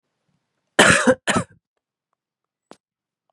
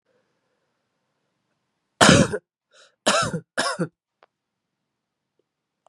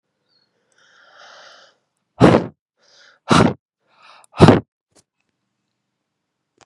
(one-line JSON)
{"cough_length": "3.3 s", "cough_amplitude": 32768, "cough_signal_mean_std_ratio": 0.29, "three_cough_length": "5.9 s", "three_cough_amplitude": 32767, "three_cough_signal_mean_std_ratio": 0.26, "exhalation_length": "6.7 s", "exhalation_amplitude": 32768, "exhalation_signal_mean_std_ratio": 0.24, "survey_phase": "beta (2021-08-13 to 2022-03-07)", "age": "18-44", "gender": "Female", "wearing_mask": "No", "symptom_runny_or_blocked_nose": true, "symptom_shortness_of_breath": true, "symptom_fatigue": true, "symptom_headache": true, "smoker_status": "Ex-smoker", "respiratory_condition_asthma": false, "respiratory_condition_other": false, "recruitment_source": "Test and Trace", "submission_delay": "2 days", "covid_test_result": "Positive", "covid_test_method": "LFT"}